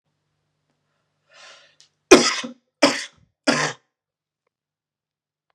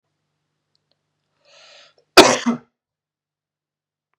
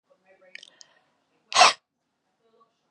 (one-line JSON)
{"three_cough_length": "5.5 s", "three_cough_amplitude": 32768, "three_cough_signal_mean_std_ratio": 0.23, "cough_length": "4.2 s", "cough_amplitude": 32768, "cough_signal_mean_std_ratio": 0.19, "exhalation_length": "2.9 s", "exhalation_amplitude": 24622, "exhalation_signal_mean_std_ratio": 0.2, "survey_phase": "beta (2021-08-13 to 2022-03-07)", "age": "18-44", "gender": "Male", "wearing_mask": "No", "symptom_none": true, "smoker_status": "Never smoked", "respiratory_condition_asthma": false, "respiratory_condition_other": false, "recruitment_source": "Test and Trace", "submission_delay": "2 days", "covid_test_method": "RT-qPCR", "covid_ct_value": 21.7, "covid_ct_gene": "ORF1ab gene"}